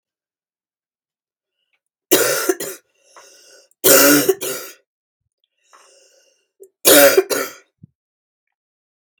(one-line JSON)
{"three_cough_length": "9.2 s", "three_cough_amplitude": 32768, "three_cough_signal_mean_std_ratio": 0.32, "survey_phase": "beta (2021-08-13 to 2022-03-07)", "age": "45-64", "gender": "Female", "wearing_mask": "No", "symptom_cough_any": true, "symptom_new_continuous_cough": true, "symptom_sore_throat": true, "symptom_fever_high_temperature": true, "symptom_headache": true, "symptom_onset": "2 days", "smoker_status": "Never smoked", "respiratory_condition_asthma": false, "respiratory_condition_other": false, "recruitment_source": "Test and Trace", "submission_delay": "1 day", "covid_test_result": "Positive", "covid_test_method": "RT-qPCR", "covid_ct_value": 27.0, "covid_ct_gene": "N gene", "covid_ct_mean": 27.0, "covid_viral_load": "1300 copies/ml", "covid_viral_load_category": "Minimal viral load (< 10K copies/ml)"}